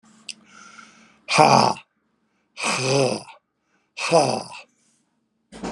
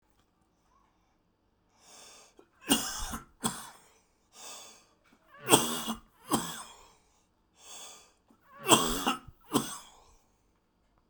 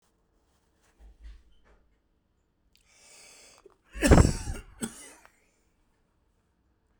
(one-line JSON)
{"exhalation_length": "5.7 s", "exhalation_amplitude": 32024, "exhalation_signal_mean_std_ratio": 0.38, "three_cough_length": "11.1 s", "three_cough_amplitude": 20639, "three_cough_signal_mean_std_ratio": 0.31, "cough_length": "7.0 s", "cough_amplitude": 20542, "cough_signal_mean_std_ratio": 0.2, "survey_phase": "beta (2021-08-13 to 2022-03-07)", "age": "65+", "gender": "Male", "wearing_mask": "No", "symptom_none": true, "symptom_onset": "5 days", "smoker_status": "Never smoked", "respiratory_condition_asthma": false, "respiratory_condition_other": false, "recruitment_source": "Test and Trace", "submission_delay": "2 days", "covid_test_result": "Positive", "covid_test_method": "RT-qPCR", "covid_ct_value": 19.9, "covid_ct_gene": "N gene", "covid_ct_mean": 20.6, "covid_viral_load": "170000 copies/ml", "covid_viral_load_category": "Low viral load (10K-1M copies/ml)"}